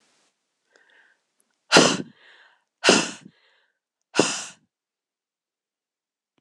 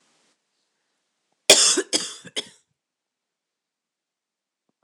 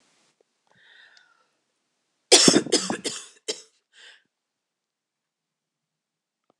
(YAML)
exhalation_length: 6.4 s
exhalation_amplitude: 26028
exhalation_signal_mean_std_ratio: 0.24
cough_length: 4.8 s
cough_amplitude: 26028
cough_signal_mean_std_ratio: 0.22
three_cough_length: 6.6 s
three_cough_amplitude: 26028
three_cough_signal_mean_std_ratio: 0.22
survey_phase: beta (2021-08-13 to 2022-03-07)
age: 45-64
gender: Female
wearing_mask: 'No'
symptom_cough_any: true
symptom_shortness_of_breath: true
symptom_fatigue: true
symptom_onset: 3 days
smoker_status: Never smoked
respiratory_condition_asthma: true
respiratory_condition_other: true
recruitment_source: REACT
submission_delay: 3 days
covid_test_result: Negative
covid_test_method: RT-qPCR
influenza_a_test_result: Negative
influenza_b_test_result: Negative